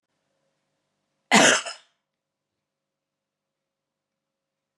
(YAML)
cough_length: 4.8 s
cough_amplitude: 27438
cough_signal_mean_std_ratio: 0.2
survey_phase: beta (2021-08-13 to 2022-03-07)
age: 65+
gender: Female
wearing_mask: 'No'
symptom_none: true
smoker_status: Never smoked
respiratory_condition_asthma: false
respiratory_condition_other: true
recruitment_source: REACT
submission_delay: 4 days
covid_test_result: Negative
covid_test_method: RT-qPCR